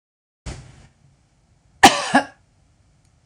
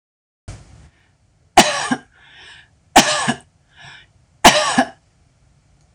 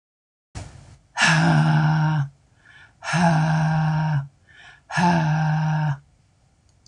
{
  "cough_length": "3.3 s",
  "cough_amplitude": 26028,
  "cough_signal_mean_std_ratio": 0.23,
  "three_cough_length": "5.9 s",
  "three_cough_amplitude": 26028,
  "three_cough_signal_mean_std_ratio": 0.31,
  "exhalation_length": "6.9 s",
  "exhalation_amplitude": 19539,
  "exhalation_signal_mean_std_ratio": 0.73,
  "survey_phase": "beta (2021-08-13 to 2022-03-07)",
  "age": "45-64",
  "gender": "Female",
  "wearing_mask": "No",
  "symptom_change_to_sense_of_smell_or_taste": true,
  "smoker_status": "Ex-smoker",
  "respiratory_condition_asthma": false,
  "respiratory_condition_other": false,
  "recruitment_source": "REACT",
  "submission_delay": "1 day",
  "covid_test_result": "Negative",
  "covid_test_method": "RT-qPCR",
  "influenza_a_test_result": "Negative",
  "influenza_b_test_result": "Negative"
}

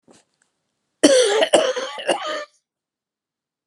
{
  "cough_length": "3.7 s",
  "cough_amplitude": 32763,
  "cough_signal_mean_std_ratio": 0.42,
  "survey_phase": "alpha (2021-03-01 to 2021-08-12)",
  "age": "45-64",
  "gender": "Female",
  "wearing_mask": "No",
  "symptom_cough_any": true,
  "symptom_new_continuous_cough": true,
  "symptom_shortness_of_breath": true,
  "symptom_fatigue": true,
  "symptom_headache": true,
  "symptom_change_to_sense_of_smell_or_taste": true,
  "smoker_status": "Never smoked",
  "respiratory_condition_asthma": true,
  "respiratory_condition_other": false,
  "recruitment_source": "Test and Trace",
  "submission_delay": "3 days",
  "covid_test_result": "Positive",
  "covid_test_method": "RT-qPCR",
  "covid_ct_value": 23.6,
  "covid_ct_gene": "ORF1ab gene",
  "covid_ct_mean": 23.7,
  "covid_viral_load": "17000 copies/ml",
  "covid_viral_load_category": "Low viral load (10K-1M copies/ml)"
}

